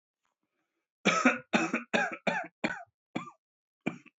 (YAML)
three_cough_length: 4.2 s
three_cough_amplitude: 11269
three_cough_signal_mean_std_ratio: 0.4
survey_phase: beta (2021-08-13 to 2022-03-07)
age: 45-64
gender: Male
wearing_mask: 'No'
symptom_cough_any: true
symptom_runny_or_blocked_nose: true
symptom_shortness_of_breath: true
symptom_sore_throat: true
symptom_fever_high_temperature: true
symptom_headache: true
symptom_onset: 3 days
smoker_status: Ex-smoker
respiratory_condition_asthma: false
respiratory_condition_other: false
recruitment_source: Test and Trace
submission_delay: 2 days
covid_test_result: Positive
covid_test_method: RT-qPCR
covid_ct_value: 15.2
covid_ct_gene: ORF1ab gene
covid_ct_mean: 15.5
covid_viral_load: 8100000 copies/ml
covid_viral_load_category: High viral load (>1M copies/ml)